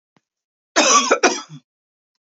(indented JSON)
{
  "cough_length": "2.2 s",
  "cough_amplitude": 30056,
  "cough_signal_mean_std_ratio": 0.4,
  "survey_phase": "beta (2021-08-13 to 2022-03-07)",
  "age": "18-44",
  "gender": "Female",
  "wearing_mask": "No",
  "symptom_cough_any": true,
  "symptom_runny_or_blocked_nose": true,
  "symptom_sore_throat": true,
  "symptom_fatigue": true,
  "symptom_headache": true,
  "symptom_onset": "3 days",
  "smoker_status": "Never smoked",
  "respiratory_condition_asthma": false,
  "respiratory_condition_other": false,
  "recruitment_source": "Test and Trace",
  "submission_delay": "2 days",
  "covid_test_result": "Positive",
  "covid_test_method": "RT-qPCR",
  "covid_ct_value": 23.5,
  "covid_ct_gene": "N gene",
  "covid_ct_mean": 23.8,
  "covid_viral_load": "16000 copies/ml",
  "covid_viral_load_category": "Low viral load (10K-1M copies/ml)"
}